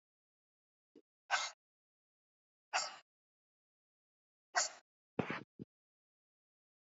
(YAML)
exhalation_length: 6.8 s
exhalation_amplitude: 3283
exhalation_signal_mean_std_ratio: 0.23
survey_phase: beta (2021-08-13 to 2022-03-07)
age: 18-44
gender: Female
wearing_mask: 'No'
symptom_none: true
smoker_status: Never smoked
respiratory_condition_asthma: true
respiratory_condition_other: false
recruitment_source: REACT
submission_delay: 1 day
covid_test_result: Negative
covid_test_method: RT-qPCR